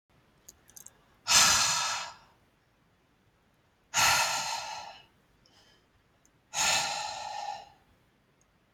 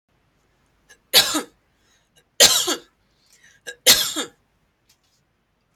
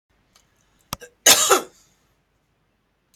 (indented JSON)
{
  "exhalation_length": "8.7 s",
  "exhalation_amplitude": 14989,
  "exhalation_signal_mean_std_ratio": 0.41,
  "three_cough_length": "5.8 s",
  "three_cough_amplitude": 32768,
  "three_cough_signal_mean_std_ratio": 0.28,
  "cough_length": "3.2 s",
  "cough_amplitude": 32768,
  "cough_signal_mean_std_ratio": 0.25,
  "survey_phase": "alpha (2021-03-01 to 2021-08-12)",
  "age": "45-64",
  "gender": "Female",
  "wearing_mask": "No",
  "symptom_none": true,
  "smoker_status": "Never smoked",
  "respiratory_condition_asthma": false,
  "respiratory_condition_other": false,
  "recruitment_source": "REACT",
  "submission_delay": "1 day",
  "covid_test_result": "Negative",
  "covid_test_method": "RT-qPCR"
}